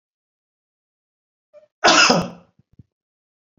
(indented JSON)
{
  "cough_length": "3.6 s",
  "cough_amplitude": 32768,
  "cough_signal_mean_std_ratio": 0.27,
  "survey_phase": "beta (2021-08-13 to 2022-03-07)",
  "age": "45-64",
  "gender": "Male",
  "wearing_mask": "No",
  "symptom_none": true,
  "smoker_status": "Never smoked",
  "respiratory_condition_asthma": false,
  "respiratory_condition_other": false,
  "recruitment_source": "REACT",
  "submission_delay": "4 days",
  "covid_test_result": "Negative",
  "covid_test_method": "RT-qPCR"
}